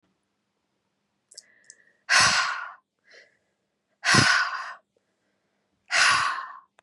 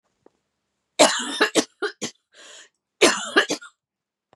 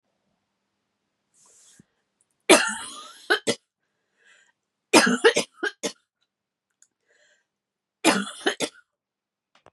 {
  "exhalation_length": "6.8 s",
  "exhalation_amplitude": 18420,
  "exhalation_signal_mean_std_ratio": 0.39,
  "cough_length": "4.4 s",
  "cough_amplitude": 29579,
  "cough_signal_mean_std_ratio": 0.35,
  "three_cough_length": "9.7 s",
  "three_cough_amplitude": 32172,
  "three_cough_signal_mean_std_ratio": 0.26,
  "survey_phase": "beta (2021-08-13 to 2022-03-07)",
  "age": "18-44",
  "gender": "Female",
  "wearing_mask": "No",
  "symptom_cough_any": true,
  "symptom_runny_or_blocked_nose": true,
  "symptom_onset": "4 days",
  "smoker_status": "Ex-smoker",
  "respiratory_condition_asthma": false,
  "respiratory_condition_other": false,
  "recruitment_source": "Test and Trace",
  "submission_delay": "1 day",
  "covid_test_result": "Positive",
  "covid_test_method": "RT-qPCR",
  "covid_ct_value": 27.0,
  "covid_ct_gene": "N gene",
  "covid_ct_mean": 27.1,
  "covid_viral_load": "1300 copies/ml",
  "covid_viral_load_category": "Minimal viral load (< 10K copies/ml)"
}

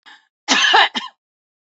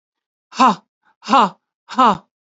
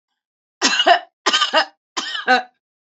{
  "cough_length": "1.8 s",
  "cough_amplitude": 31133,
  "cough_signal_mean_std_ratio": 0.42,
  "exhalation_length": "2.6 s",
  "exhalation_amplitude": 28444,
  "exhalation_signal_mean_std_ratio": 0.36,
  "three_cough_length": "2.8 s",
  "three_cough_amplitude": 28656,
  "three_cough_signal_mean_std_ratio": 0.47,
  "survey_phase": "beta (2021-08-13 to 2022-03-07)",
  "age": "45-64",
  "gender": "Female",
  "wearing_mask": "No",
  "symptom_none": true,
  "smoker_status": "Ex-smoker",
  "respiratory_condition_asthma": true,
  "respiratory_condition_other": false,
  "recruitment_source": "Test and Trace",
  "submission_delay": "1 day",
  "covid_test_result": "Negative",
  "covid_test_method": "RT-qPCR"
}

